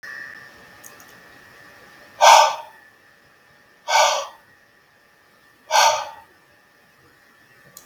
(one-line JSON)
{"exhalation_length": "7.9 s", "exhalation_amplitude": 32768, "exhalation_signal_mean_std_ratio": 0.3, "survey_phase": "beta (2021-08-13 to 2022-03-07)", "age": "65+", "gender": "Male", "wearing_mask": "No", "symptom_cough_any": true, "smoker_status": "Never smoked", "respiratory_condition_asthma": false, "respiratory_condition_other": false, "recruitment_source": "REACT", "submission_delay": "2 days", "covid_test_result": "Negative", "covid_test_method": "RT-qPCR", "influenza_a_test_result": "Negative", "influenza_b_test_result": "Negative"}